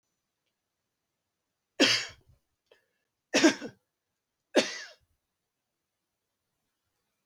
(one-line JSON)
{"three_cough_length": "7.3 s", "three_cough_amplitude": 13233, "three_cough_signal_mean_std_ratio": 0.22, "survey_phase": "beta (2021-08-13 to 2022-03-07)", "age": "65+", "gender": "Male", "wearing_mask": "No", "symptom_cough_any": true, "symptom_runny_or_blocked_nose": true, "smoker_status": "Never smoked", "respiratory_condition_asthma": false, "respiratory_condition_other": false, "recruitment_source": "REACT", "submission_delay": "1 day", "covid_test_result": "Negative", "covid_test_method": "RT-qPCR", "influenza_a_test_result": "Negative", "influenza_b_test_result": "Negative"}